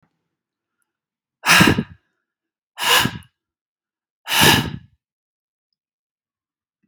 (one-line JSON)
{"exhalation_length": "6.9 s", "exhalation_amplitude": 32768, "exhalation_signal_mean_std_ratio": 0.3, "survey_phase": "beta (2021-08-13 to 2022-03-07)", "age": "65+", "gender": "Male", "wearing_mask": "No", "symptom_none": true, "symptom_onset": "12 days", "smoker_status": "Never smoked", "respiratory_condition_asthma": false, "respiratory_condition_other": false, "recruitment_source": "REACT", "submission_delay": "1 day", "covid_test_result": "Negative", "covid_test_method": "RT-qPCR"}